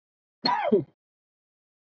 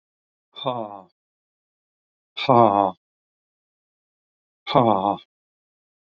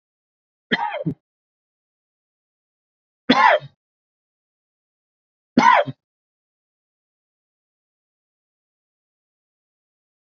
{
  "cough_length": "1.9 s",
  "cough_amplitude": 10877,
  "cough_signal_mean_std_ratio": 0.35,
  "exhalation_length": "6.1 s",
  "exhalation_amplitude": 30730,
  "exhalation_signal_mean_std_ratio": 0.28,
  "three_cough_length": "10.3 s",
  "three_cough_amplitude": 28556,
  "three_cough_signal_mean_std_ratio": 0.21,
  "survey_phase": "beta (2021-08-13 to 2022-03-07)",
  "age": "45-64",
  "gender": "Male",
  "wearing_mask": "No",
  "symptom_none": true,
  "smoker_status": "Ex-smoker",
  "respiratory_condition_asthma": false,
  "respiratory_condition_other": false,
  "recruitment_source": "REACT",
  "submission_delay": "3 days",
  "covid_test_result": "Negative",
  "covid_test_method": "RT-qPCR",
  "influenza_a_test_result": "Negative",
  "influenza_b_test_result": "Negative"
}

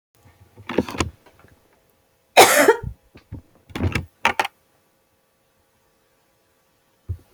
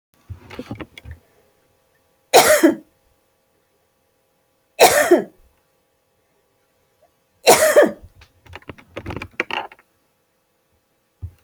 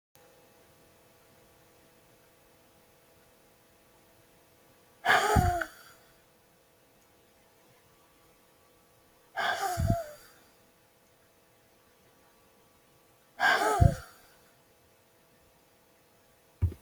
{
  "cough_length": "7.3 s",
  "cough_amplitude": 32768,
  "cough_signal_mean_std_ratio": 0.26,
  "three_cough_length": "11.4 s",
  "three_cough_amplitude": 32767,
  "three_cough_signal_mean_std_ratio": 0.28,
  "exhalation_length": "16.8 s",
  "exhalation_amplitude": 13652,
  "exhalation_signal_mean_std_ratio": 0.28,
  "survey_phase": "alpha (2021-03-01 to 2021-08-12)",
  "age": "45-64",
  "gender": "Female",
  "wearing_mask": "No",
  "symptom_fatigue": true,
  "symptom_onset": "13 days",
  "smoker_status": "Never smoked",
  "respiratory_condition_asthma": false,
  "respiratory_condition_other": false,
  "recruitment_source": "REACT",
  "submission_delay": "2 days",
  "covid_test_result": "Negative",
  "covid_test_method": "RT-qPCR"
}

